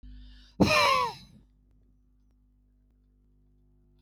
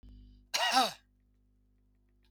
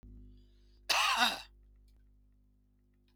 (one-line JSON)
{"exhalation_length": "4.0 s", "exhalation_amplitude": 11637, "exhalation_signal_mean_std_ratio": 0.32, "three_cough_length": "2.3 s", "three_cough_amplitude": 7082, "three_cough_signal_mean_std_ratio": 0.33, "cough_length": "3.2 s", "cough_amplitude": 7804, "cough_signal_mean_std_ratio": 0.36, "survey_phase": "beta (2021-08-13 to 2022-03-07)", "age": "65+", "gender": "Male", "wearing_mask": "No", "symptom_none": true, "smoker_status": "Never smoked", "respiratory_condition_asthma": true, "respiratory_condition_other": false, "recruitment_source": "REACT", "submission_delay": "4 days", "covid_test_result": "Negative", "covid_test_method": "RT-qPCR", "influenza_a_test_result": "Negative", "influenza_b_test_result": "Negative"}